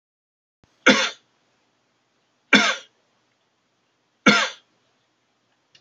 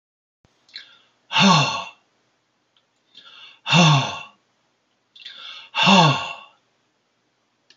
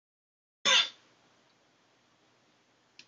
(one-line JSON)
{"three_cough_length": "5.8 s", "three_cough_amplitude": 30245, "three_cough_signal_mean_std_ratio": 0.25, "exhalation_length": "7.8 s", "exhalation_amplitude": 25338, "exhalation_signal_mean_std_ratio": 0.36, "cough_length": "3.1 s", "cough_amplitude": 7941, "cough_signal_mean_std_ratio": 0.22, "survey_phase": "alpha (2021-03-01 to 2021-08-12)", "age": "65+", "gender": "Male", "wearing_mask": "No", "symptom_none": true, "smoker_status": "Prefer not to say", "respiratory_condition_asthma": false, "respiratory_condition_other": false, "recruitment_source": "REACT", "submission_delay": "2 days", "covid_test_result": "Negative", "covid_test_method": "RT-qPCR"}